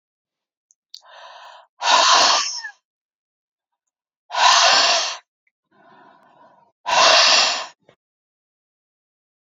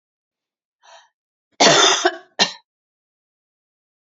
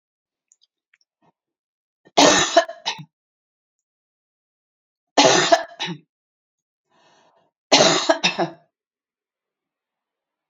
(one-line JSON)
{"exhalation_length": "9.5 s", "exhalation_amplitude": 28327, "exhalation_signal_mean_std_ratio": 0.41, "cough_length": "4.1 s", "cough_amplitude": 32767, "cough_signal_mean_std_ratio": 0.3, "three_cough_length": "10.5 s", "three_cough_amplitude": 32767, "three_cough_signal_mean_std_ratio": 0.29, "survey_phase": "beta (2021-08-13 to 2022-03-07)", "age": "65+", "gender": "Female", "wearing_mask": "No", "symptom_none": true, "smoker_status": "Ex-smoker", "respiratory_condition_asthma": false, "respiratory_condition_other": false, "recruitment_source": "REACT", "submission_delay": "5 days", "covid_test_result": "Negative", "covid_test_method": "RT-qPCR"}